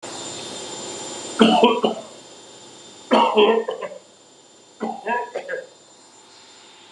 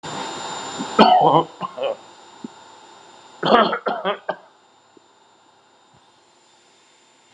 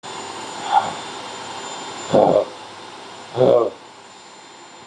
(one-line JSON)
{"three_cough_length": "6.9 s", "three_cough_amplitude": 32708, "three_cough_signal_mean_std_ratio": 0.46, "cough_length": "7.3 s", "cough_amplitude": 32768, "cough_signal_mean_std_ratio": 0.37, "exhalation_length": "4.9 s", "exhalation_amplitude": 31440, "exhalation_signal_mean_std_ratio": 0.5, "survey_phase": "alpha (2021-03-01 to 2021-08-12)", "age": "65+", "gender": "Male", "wearing_mask": "No", "symptom_none": true, "smoker_status": "Ex-smoker", "respiratory_condition_asthma": false, "respiratory_condition_other": false, "recruitment_source": "REACT", "submission_delay": "2 days", "covid_test_result": "Negative", "covid_test_method": "RT-qPCR"}